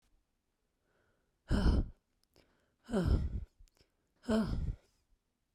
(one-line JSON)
{"exhalation_length": "5.5 s", "exhalation_amplitude": 4626, "exhalation_signal_mean_std_ratio": 0.4, "survey_phase": "beta (2021-08-13 to 2022-03-07)", "age": "18-44", "gender": "Female", "wearing_mask": "No", "symptom_cough_any": true, "symptom_new_continuous_cough": true, "symptom_sore_throat": true, "symptom_change_to_sense_of_smell_or_taste": true, "smoker_status": "Never smoked", "respiratory_condition_asthma": false, "respiratory_condition_other": false, "recruitment_source": "Test and Trace", "submission_delay": "1 day", "covid_test_result": "Negative", "covid_test_method": "RT-qPCR"}